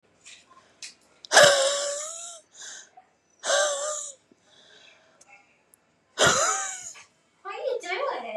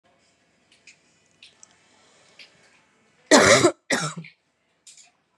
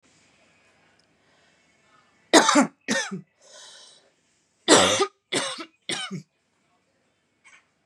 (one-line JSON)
{"exhalation_length": "8.4 s", "exhalation_amplitude": 26564, "exhalation_signal_mean_std_ratio": 0.42, "cough_length": "5.4 s", "cough_amplitude": 31455, "cough_signal_mean_std_ratio": 0.26, "three_cough_length": "7.9 s", "three_cough_amplitude": 29818, "three_cough_signal_mean_std_ratio": 0.3, "survey_phase": "beta (2021-08-13 to 2022-03-07)", "age": "18-44", "gender": "Female", "wearing_mask": "No", "symptom_cough_any": true, "symptom_runny_or_blocked_nose": true, "symptom_shortness_of_breath": true, "symptom_sore_throat": true, "symptom_abdominal_pain": true, "symptom_fatigue": true, "symptom_fever_high_temperature": true, "symptom_headache": true, "symptom_other": true, "symptom_onset": "3 days", "smoker_status": "Ex-smoker", "respiratory_condition_asthma": true, "respiratory_condition_other": false, "recruitment_source": "Test and Trace", "submission_delay": "2 days", "covid_test_result": "Positive", "covid_test_method": "RT-qPCR", "covid_ct_value": 21.1, "covid_ct_gene": "ORF1ab gene", "covid_ct_mean": 21.7, "covid_viral_load": "75000 copies/ml", "covid_viral_load_category": "Low viral load (10K-1M copies/ml)"}